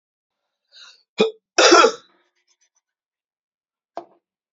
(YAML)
cough_length: 4.5 s
cough_amplitude: 31275
cough_signal_mean_std_ratio: 0.25
survey_phase: beta (2021-08-13 to 2022-03-07)
age: 18-44
gender: Male
wearing_mask: 'No'
symptom_cough_any: true
symptom_runny_or_blocked_nose: true
symptom_sore_throat: true
symptom_fatigue: true
symptom_headache: true
symptom_other: true
smoker_status: Never smoked
respiratory_condition_asthma: false
respiratory_condition_other: false
recruitment_source: Test and Trace
submission_delay: 1 day
covid_test_result: Positive
covid_test_method: ePCR